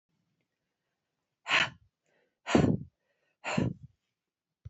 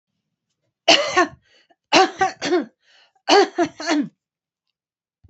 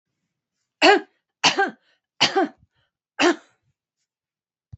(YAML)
exhalation_length: 4.7 s
exhalation_amplitude: 11360
exhalation_signal_mean_std_ratio: 0.3
three_cough_length: 5.3 s
three_cough_amplitude: 32768
three_cough_signal_mean_std_ratio: 0.39
cough_length: 4.8 s
cough_amplitude: 26468
cough_signal_mean_std_ratio: 0.31
survey_phase: beta (2021-08-13 to 2022-03-07)
age: 65+
gender: Female
wearing_mask: 'No'
symptom_none: true
smoker_status: Never smoked
respiratory_condition_asthma: false
respiratory_condition_other: false
recruitment_source: REACT
submission_delay: 1 day
covid_test_result: Negative
covid_test_method: RT-qPCR
influenza_a_test_result: Negative
influenza_b_test_result: Negative